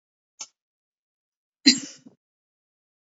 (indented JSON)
{
  "cough_length": "3.2 s",
  "cough_amplitude": 29355,
  "cough_signal_mean_std_ratio": 0.15,
  "survey_phase": "beta (2021-08-13 to 2022-03-07)",
  "age": "65+",
  "gender": "Female",
  "wearing_mask": "No",
  "symptom_none": true,
  "smoker_status": "Never smoked",
  "respiratory_condition_asthma": false,
  "respiratory_condition_other": false,
  "recruitment_source": "REACT",
  "submission_delay": "2 days",
  "covid_test_result": "Negative",
  "covid_test_method": "RT-qPCR",
  "influenza_a_test_result": "Negative",
  "influenza_b_test_result": "Negative"
}